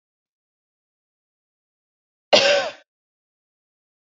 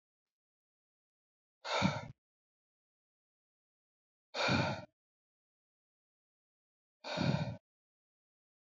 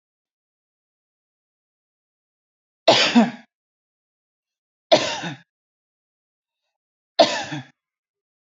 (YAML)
cough_length: 4.2 s
cough_amplitude: 27573
cough_signal_mean_std_ratio: 0.22
exhalation_length: 8.6 s
exhalation_amplitude: 4745
exhalation_signal_mean_std_ratio: 0.3
three_cough_length: 8.4 s
three_cough_amplitude: 29364
three_cough_signal_mean_std_ratio: 0.24
survey_phase: beta (2021-08-13 to 2022-03-07)
age: 45-64
gender: Female
wearing_mask: 'No'
symptom_none: true
smoker_status: Ex-smoker
respiratory_condition_asthma: false
respiratory_condition_other: false
recruitment_source: REACT
submission_delay: 1 day
covid_test_result: Negative
covid_test_method: RT-qPCR